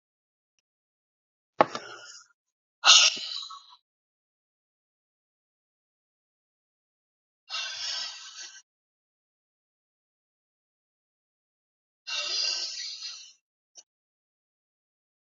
{"exhalation_length": "15.4 s", "exhalation_amplitude": 27777, "exhalation_signal_mean_std_ratio": 0.22, "survey_phase": "alpha (2021-03-01 to 2021-08-12)", "age": "45-64", "gender": "Male", "wearing_mask": "No", "symptom_cough_any": true, "symptom_fever_high_temperature": true, "symptom_headache": true, "symptom_change_to_sense_of_smell_or_taste": true, "symptom_loss_of_taste": true, "symptom_onset": "4 days", "smoker_status": "Ex-smoker", "respiratory_condition_asthma": false, "respiratory_condition_other": false, "recruitment_source": "Test and Trace", "submission_delay": "2 days", "covid_test_result": "Positive", "covid_test_method": "RT-qPCR"}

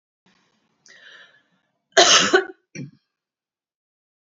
{"cough_length": "4.3 s", "cough_amplitude": 28696, "cough_signal_mean_std_ratio": 0.26, "survey_phase": "beta (2021-08-13 to 2022-03-07)", "age": "45-64", "gender": "Female", "wearing_mask": "No", "symptom_none": true, "smoker_status": "Never smoked", "respiratory_condition_asthma": false, "respiratory_condition_other": false, "recruitment_source": "REACT", "submission_delay": "1 day", "covid_test_result": "Negative", "covid_test_method": "RT-qPCR"}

